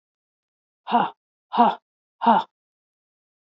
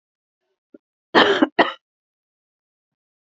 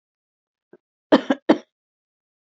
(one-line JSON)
{"exhalation_length": "3.6 s", "exhalation_amplitude": 21141, "exhalation_signal_mean_std_ratio": 0.31, "three_cough_length": "3.2 s", "three_cough_amplitude": 27831, "three_cough_signal_mean_std_ratio": 0.26, "cough_length": "2.6 s", "cough_amplitude": 27641, "cough_signal_mean_std_ratio": 0.2, "survey_phase": "beta (2021-08-13 to 2022-03-07)", "age": "45-64", "gender": "Female", "wearing_mask": "No", "symptom_cough_any": true, "symptom_runny_or_blocked_nose": true, "symptom_change_to_sense_of_smell_or_taste": true, "symptom_loss_of_taste": true, "symptom_onset": "4 days", "smoker_status": "Ex-smoker", "respiratory_condition_asthma": false, "respiratory_condition_other": false, "recruitment_source": "Test and Trace", "submission_delay": "2 days", "covid_test_result": "Positive", "covid_test_method": "LAMP"}